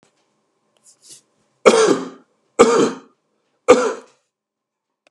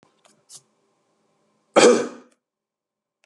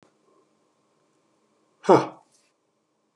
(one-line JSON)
{"three_cough_length": "5.1 s", "three_cough_amplitude": 32768, "three_cough_signal_mean_std_ratio": 0.33, "cough_length": "3.3 s", "cough_amplitude": 30450, "cough_signal_mean_std_ratio": 0.24, "exhalation_length": "3.2 s", "exhalation_amplitude": 25762, "exhalation_signal_mean_std_ratio": 0.17, "survey_phase": "beta (2021-08-13 to 2022-03-07)", "age": "45-64", "gender": "Male", "wearing_mask": "No", "symptom_none": true, "smoker_status": "Never smoked", "respiratory_condition_asthma": false, "respiratory_condition_other": false, "recruitment_source": "REACT", "submission_delay": "1 day", "covid_test_result": "Negative", "covid_test_method": "RT-qPCR"}